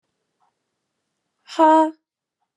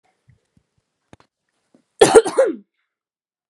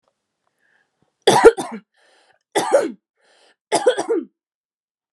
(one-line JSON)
{"exhalation_length": "2.6 s", "exhalation_amplitude": 23557, "exhalation_signal_mean_std_ratio": 0.28, "cough_length": "3.5 s", "cough_amplitude": 32768, "cough_signal_mean_std_ratio": 0.25, "three_cough_length": "5.1 s", "three_cough_amplitude": 32768, "three_cough_signal_mean_std_ratio": 0.32, "survey_phase": "beta (2021-08-13 to 2022-03-07)", "age": "18-44", "gender": "Female", "wearing_mask": "Yes", "symptom_none": true, "smoker_status": "Never smoked", "respiratory_condition_asthma": false, "respiratory_condition_other": false, "recruitment_source": "REACT", "submission_delay": "0 days", "covid_test_result": "Negative", "covid_test_method": "RT-qPCR"}